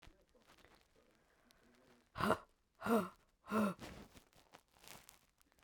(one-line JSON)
{"exhalation_length": "5.6 s", "exhalation_amplitude": 3858, "exhalation_signal_mean_std_ratio": 0.31, "survey_phase": "beta (2021-08-13 to 2022-03-07)", "age": "45-64", "gender": "Female", "wearing_mask": "No", "symptom_sore_throat": true, "symptom_headache": true, "symptom_onset": "12 days", "smoker_status": "Current smoker (11 or more cigarettes per day)", "respiratory_condition_asthma": false, "respiratory_condition_other": false, "recruitment_source": "REACT", "submission_delay": "1 day", "covid_test_result": "Negative", "covid_test_method": "RT-qPCR"}